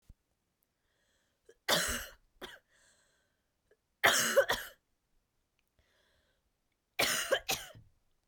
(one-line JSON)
{"three_cough_length": "8.3 s", "three_cough_amplitude": 9426, "three_cough_signal_mean_std_ratio": 0.31, "survey_phase": "beta (2021-08-13 to 2022-03-07)", "age": "18-44", "gender": "Female", "wearing_mask": "No", "symptom_cough_any": true, "symptom_new_continuous_cough": true, "symptom_runny_or_blocked_nose": true, "symptom_sore_throat": true, "symptom_fatigue": true, "symptom_headache": true, "smoker_status": "Never smoked", "respiratory_condition_asthma": false, "respiratory_condition_other": false, "recruitment_source": "Test and Trace", "submission_delay": "1 day", "covid_test_result": "Negative", "covid_test_method": "RT-qPCR"}